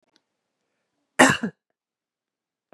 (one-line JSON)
{"cough_length": "2.7 s", "cough_amplitude": 29664, "cough_signal_mean_std_ratio": 0.2, "survey_phase": "beta (2021-08-13 to 2022-03-07)", "age": "45-64", "gender": "Female", "wearing_mask": "No", "symptom_cough_any": true, "symptom_runny_or_blocked_nose": true, "smoker_status": "Ex-smoker", "respiratory_condition_asthma": false, "respiratory_condition_other": false, "recruitment_source": "Test and Trace", "submission_delay": "2 days", "covid_test_result": "Positive", "covid_test_method": "RT-qPCR", "covid_ct_value": 20.8, "covid_ct_gene": "N gene"}